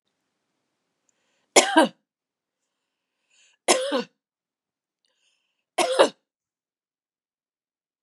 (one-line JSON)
{"three_cough_length": "8.0 s", "three_cough_amplitude": 31778, "three_cough_signal_mean_std_ratio": 0.23, "survey_phase": "beta (2021-08-13 to 2022-03-07)", "age": "45-64", "gender": "Female", "wearing_mask": "No", "symptom_none": true, "symptom_onset": "13 days", "smoker_status": "Never smoked", "respiratory_condition_asthma": true, "respiratory_condition_other": false, "recruitment_source": "REACT", "submission_delay": "2 days", "covid_test_result": "Negative", "covid_test_method": "RT-qPCR", "influenza_a_test_result": "Negative", "influenza_b_test_result": "Negative"}